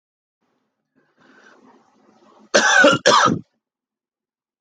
cough_length: 4.6 s
cough_amplitude: 26934
cough_signal_mean_std_ratio: 0.33
survey_phase: alpha (2021-03-01 to 2021-08-12)
age: 18-44
gender: Male
wearing_mask: 'No'
symptom_fatigue: true
symptom_onset: 4 days
smoker_status: Never smoked
respiratory_condition_asthma: true
respiratory_condition_other: false
recruitment_source: Test and Trace
submission_delay: 2 days
covid_test_result: Positive
covid_test_method: RT-qPCR
covid_ct_value: 12.2
covid_ct_gene: ORF1ab gene
covid_ct_mean: 13.0
covid_viral_load: 54000000 copies/ml
covid_viral_load_category: High viral load (>1M copies/ml)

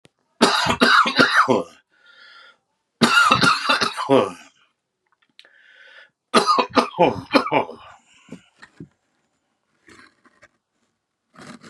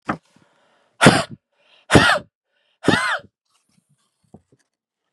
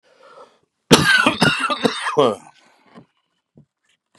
three_cough_length: 11.7 s
three_cough_amplitude: 31947
three_cough_signal_mean_std_ratio: 0.41
exhalation_length: 5.1 s
exhalation_amplitude: 32768
exhalation_signal_mean_std_ratio: 0.3
cough_length: 4.2 s
cough_amplitude: 32768
cough_signal_mean_std_ratio: 0.41
survey_phase: beta (2021-08-13 to 2022-03-07)
age: 45-64
gender: Male
wearing_mask: 'No'
symptom_runny_or_blocked_nose: true
symptom_shortness_of_breath: true
symptom_fatigue: true
symptom_change_to_sense_of_smell_or_taste: true
symptom_onset: 2 days
smoker_status: Ex-smoker
respiratory_condition_asthma: false
respiratory_condition_other: false
recruitment_source: Test and Trace
submission_delay: 1 day
covid_test_result: Positive
covid_test_method: RT-qPCR
covid_ct_value: 22.0
covid_ct_gene: N gene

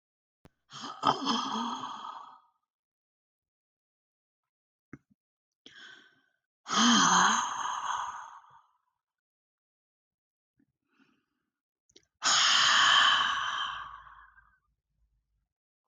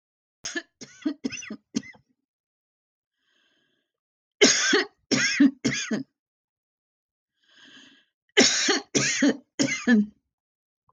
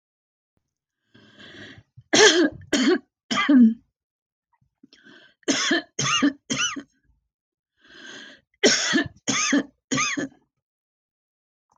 exhalation_length: 15.9 s
exhalation_amplitude: 9537
exhalation_signal_mean_std_ratio: 0.39
three_cough_length: 10.9 s
three_cough_amplitude: 16722
three_cough_signal_mean_std_ratio: 0.39
cough_length: 11.8 s
cough_amplitude: 21154
cough_signal_mean_std_ratio: 0.41
survey_phase: alpha (2021-03-01 to 2021-08-12)
age: 65+
gender: Female
wearing_mask: 'No'
symptom_none: true
smoker_status: Never smoked
respiratory_condition_asthma: false
respiratory_condition_other: false
recruitment_source: REACT
submission_delay: 2 days
covid_test_result: Negative
covid_test_method: RT-qPCR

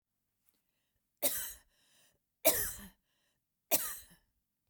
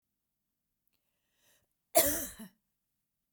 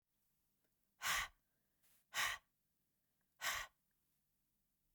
three_cough_length: 4.7 s
three_cough_amplitude: 8453
three_cough_signal_mean_std_ratio: 0.29
cough_length: 3.3 s
cough_amplitude: 10584
cough_signal_mean_std_ratio: 0.22
exhalation_length: 4.9 s
exhalation_amplitude: 1371
exhalation_signal_mean_std_ratio: 0.31
survey_phase: beta (2021-08-13 to 2022-03-07)
age: 45-64
gender: Female
wearing_mask: 'No'
symptom_runny_or_blocked_nose: true
symptom_fatigue: true
smoker_status: Never smoked
respiratory_condition_asthma: false
respiratory_condition_other: false
recruitment_source: REACT
submission_delay: 1 day
covid_test_result: Negative
covid_test_method: RT-qPCR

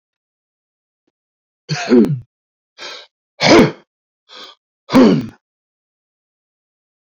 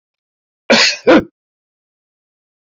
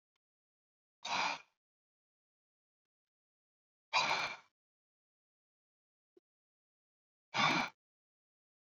three_cough_length: 7.2 s
three_cough_amplitude: 29705
three_cough_signal_mean_std_ratio: 0.31
cough_length: 2.7 s
cough_amplitude: 29389
cough_signal_mean_std_ratio: 0.31
exhalation_length: 8.7 s
exhalation_amplitude: 5623
exhalation_signal_mean_std_ratio: 0.27
survey_phase: beta (2021-08-13 to 2022-03-07)
age: 65+
gender: Male
wearing_mask: 'No'
symptom_none: true
smoker_status: Ex-smoker
respiratory_condition_asthma: false
respiratory_condition_other: false
recruitment_source: REACT
submission_delay: 2 days
covid_test_result: Negative
covid_test_method: RT-qPCR
influenza_a_test_result: Negative
influenza_b_test_result: Negative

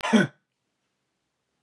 cough_length: 1.6 s
cough_amplitude: 14268
cough_signal_mean_std_ratio: 0.28
survey_phase: beta (2021-08-13 to 2022-03-07)
age: 45-64
gender: Male
wearing_mask: 'No'
symptom_sore_throat: true
smoker_status: Never smoked
respiratory_condition_asthma: true
respiratory_condition_other: false
recruitment_source: Test and Trace
submission_delay: 2 days
covid_test_result: Positive
covid_test_method: LFT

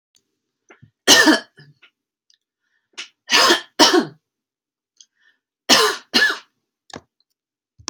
three_cough_length: 7.9 s
three_cough_amplitude: 32768
three_cough_signal_mean_std_ratio: 0.33
survey_phase: beta (2021-08-13 to 2022-03-07)
age: 18-44
gender: Female
wearing_mask: 'No'
symptom_none: true
smoker_status: Never smoked
respiratory_condition_asthma: false
respiratory_condition_other: false
recruitment_source: REACT
submission_delay: 2 days
covid_test_result: Negative
covid_test_method: RT-qPCR
influenza_a_test_result: Negative
influenza_b_test_result: Negative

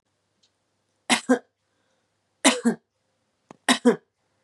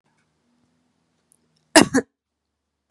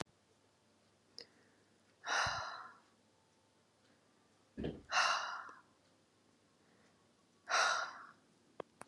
three_cough_length: 4.4 s
three_cough_amplitude: 27945
three_cough_signal_mean_std_ratio: 0.27
cough_length: 2.9 s
cough_amplitude: 32768
cough_signal_mean_std_ratio: 0.17
exhalation_length: 8.9 s
exhalation_amplitude: 3628
exhalation_signal_mean_std_ratio: 0.36
survey_phase: beta (2021-08-13 to 2022-03-07)
age: 18-44
gender: Female
wearing_mask: 'No'
symptom_cough_any: true
symptom_runny_or_blocked_nose: true
symptom_sore_throat: true
symptom_fatigue: true
symptom_onset: 3 days
smoker_status: Never smoked
respiratory_condition_asthma: false
respiratory_condition_other: false
recruitment_source: Test and Trace
submission_delay: 2 days
covid_test_result: Positive
covid_test_method: RT-qPCR
covid_ct_value: 32.1
covid_ct_gene: ORF1ab gene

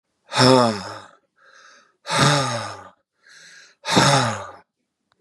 exhalation_length: 5.2 s
exhalation_amplitude: 30871
exhalation_signal_mean_std_ratio: 0.43
survey_phase: beta (2021-08-13 to 2022-03-07)
age: 45-64
gender: Male
wearing_mask: 'No'
symptom_none: true
smoker_status: Never smoked
respiratory_condition_asthma: false
respiratory_condition_other: false
recruitment_source: REACT
submission_delay: 0 days
covid_test_result: Negative
covid_test_method: RT-qPCR
influenza_a_test_result: Negative
influenza_b_test_result: Negative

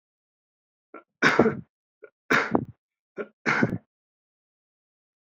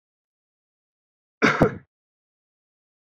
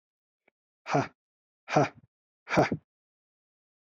three_cough_length: 5.2 s
three_cough_amplitude: 23221
three_cough_signal_mean_std_ratio: 0.31
cough_length: 3.1 s
cough_amplitude: 22295
cough_signal_mean_std_ratio: 0.22
exhalation_length: 3.8 s
exhalation_amplitude: 10839
exhalation_signal_mean_std_ratio: 0.29
survey_phase: beta (2021-08-13 to 2022-03-07)
age: 18-44
gender: Male
wearing_mask: 'No'
symptom_cough_any: true
symptom_headache: true
smoker_status: Never smoked
respiratory_condition_asthma: false
respiratory_condition_other: false
recruitment_source: Test and Trace
submission_delay: 3 days
covid_test_result: Positive
covid_test_method: ePCR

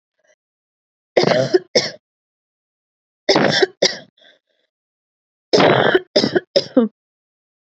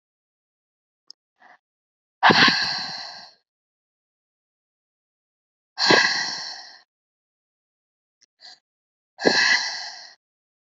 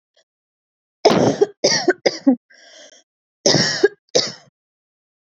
three_cough_length: 7.8 s
three_cough_amplitude: 31426
three_cough_signal_mean_std_ratio: 0.38
exhalation_length: 10.8 s
exhalation_amplitude: 26906
exhalation_signal_mean_std_ratio: 0.31
cough_length: 5.3 s
cough_amplitude: 32767
cough_signal_mean_std_ratio: 0.39
survey_phase: beta (2021-08-13 to 2022-03-07)
age: 18-44
gender: Female
wearing_mask: 'No'
symptom_cough_any: true
symptom_fever_high_temperature: true
smoker_status: Current smoker (e-cigarettes or vapes only)
respiratory_condition_asthma: false
respiratory_condition_other: false
recruitment_source: REACT
submission_delay: 4 days
covid_test_result: Negative
covid_test_method: RT-qPCR
influenza_a_test_result: Unknown/Void
influenza_b_test_result: Unknown/Void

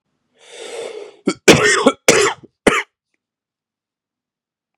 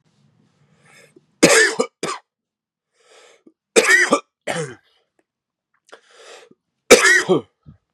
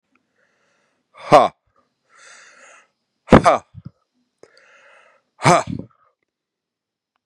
cough_length: 4.8 s
cough_amplitude: 32768
cough_signal_mean_std_ratio: 0.35
three_cough_length: 7.9 s
three_cough_amplitude: 32768
three_cough_signal_mean_std_ratio: 0.33
exhalation_length: 7.3 s
exhalation_amplitude: 32768
exhalation_signal_mean_std_ratio: 0.22
survey_phase: beta (2021-08-13 to 2022-03-07)
age: 18-44
gender: Male
wearing_mask: 'No'
symptom_cough_any: true
symptom_runny_or_blocked_nose: true
symptom_fever_high_temperature: true
symptom_headache: true
symptom_onset: 2 days
smoker_status: Ex-smoker
respiratory_condition_asthma: true
respiratory_condition_other: false
recruitment_source: Test and Trace
submission_delay: 1 day
covid_test_result: Positive
covid_test_method: RT-qPCR
covid_ct_value: 17.1
covid_ct_gene: ORF1ab gene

